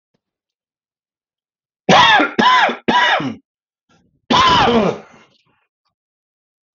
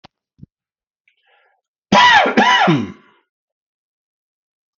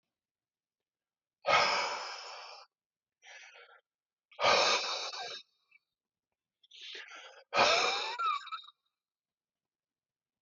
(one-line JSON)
{"three_cough_length": "6.7 s", "three_cough_amplitude": 32768, "three_cough_signal_mean_std_ratio": 0.45, "cough_length": "4.8 s", "cough_amplitude": 32631, "cough_signal_mean_std_ratio": 0.36, "exhalation_length": "10.4 s", "exhalation_amplitude": 6452, "exhalation_signal_mean_std_ratio": 0.39, "survey_phase": "beta (2021-08-13 to 2022-03-07)", "age": "45-64", "gender": "Male", "wearing_mask": "No", "symptom_sore_throat": true, "symptom_fatigue": true, "symptom_onset": "3 days", "smoker_status": "Never smoked", "respiratory_condition_asthma": false, "respiratory_condition_other": false, "recruitment_source": "Test and Trace", "submission_delay": "2 days", "covid_test_result": "Positive", "covid_test_method": "RT-qPCR", "covid_ct_value": 31.5, "covid_ct_gene": "N gene"}